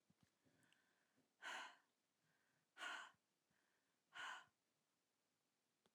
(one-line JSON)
{"exhalation_length": "5.9 s", "exhalation_amplitude": 297, "exhalation_signal_mean_std_ratio": 0.35, "survey_phase": "alpha (2021-03-01 to 2021-08-12)", "age": "65+", "gender": "Female", "wearing_mask": "No", "symptom_none": true, "smoker_status": "Ex-smoker", "respiratory_condition_asthma": false, "respiratory_condition_other": true, "recruitment_source": "REACT", "submission_delay": "2 days", "covid_test_result": "Negative", "covid_test_method": "RT-qPCR"}